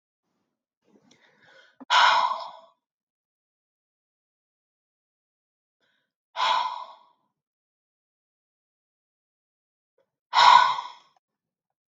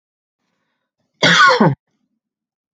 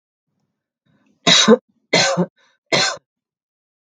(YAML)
exhalation_length: 11.9 s
exhalation_amplitude: 24497
exhalation_signal_mean_std_ratio: 0.25
cough_length: 2.7 s
cough_amplitude: 32768
cough_signal_mean_std_ratio: 0.35
three_cough_length: 3.8 s
three_cough_amplitude: 32766
three_cough_signal_mean_std_ratio: 0.36
survey_phase: beta (2021-08-13 to 2022-03-07)
age: 45-64
gender: Female
wearing_mask: 'No'
symptom_runny_or_blocked_nose: true
symptom_sore_throat: true
symptom_fatigue: true
symptom_headache: true
symptom_onset: 3 days
smoker_status: Ex-smoker
respiratory_condition_asthma: false
respiratory_condition_other: false
recruitment_source: Test and Trace
submission_delay: 1 day
covid_test_result: Positive
covid_test_method: RT-qPCR